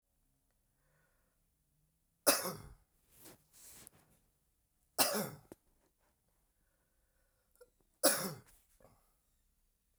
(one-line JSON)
{"three_cough_length": "10.0 s", "three_cough_amplitude": 9496, "three_cough_signal_mean_std_ratio": 0.22, "survey_phase": "beta (2021-08-13 to 2022-03-07)", "age": "65+", "gender": "Male", "wearing_mask": "No", "symptom_cough_any": true, "symptom_runny_or_blocked_nose": true, "smoker_status": "Never smoked", "respiratory_condition_asthma": false, "respiratory_condition_other": false, "recruitment_source": "Test and Trace", "submission_delay": "1 day", "covid_test_result": "Positive", "covid_test_method": "RT-qPCR", "covid_ct_value": 18.8, "covid_ct_gene": "ORF1ab gene"}